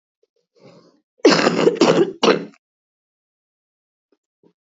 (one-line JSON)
{"cough_length": "4.6 s", "cough_amplitude": 27303, "cough_signal_mean_std_ratio": 0.36, "survey_phase": "beta (2021-08-13 to 2022-03-07)", "age": "18-44", "gender": "Female", "wearing_mask": "No", "symptom_cough_any": true, "symptom_runny_or_blocked_nose": true, "symptom_fatigue": true, "smoker_status": "Never smoked", "respiratory_condition_asthma": true, "respiratory_condition_other": false, "recruitment_source": "REACT", "submission_delay": "1 day", "covid_test_result": "Negative", "covid_test_method": "RT-qPCR", "influenza_a_test_result": "Unknown/Void", "influenza_b_test_result": "Unknown/Void"}